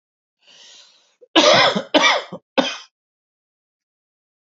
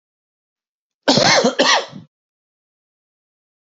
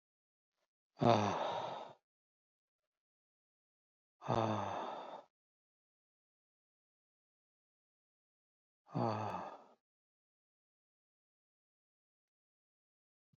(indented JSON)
{
  "three_cough_length": "4.5 s",
  "three_cough_amplitude": 28823,
  "three_cough_signal_mean_std_ratio": 0.35,
  "cough_length": "3.8 s",
  "cough_amplitude": 31072,
  "cough_signal_mean_std_ratio": 0.35,
  "exhalation_length": "13.4 s",
  "exhalation_amplitude": 5321,
  "exhalation_signal_mean_std_ratio": 0.28,
  "survey_phase": "beta (2021-08-13 to 2022-03-07)",
  "age": "45-64",
  "gender": "Male",
  "wearing_mask": "No",
  "symptom_cough_any": true,
  "symptom_runny_or_blocked_nose": true,
  "symptom_shortness_of_breath": true,
  "symptom_diarrhoea": true,
  "symptom_fatigue": true,
  "symptom_onset": "12 days",
  "smoker_status": "Ex-smoker",
  "respiratory_condition_asthma": false,
  "respiratory_condition_other": false,
  "recruitment_source": "REACT",
  "submission_delay": "4 days",
  "covid_test_result": "Negative",
  "covid_test_method": "RT-qPCR",
  "influenza_a_test_result": "Negative",
  "influenza_b_test_result": "Negative"
}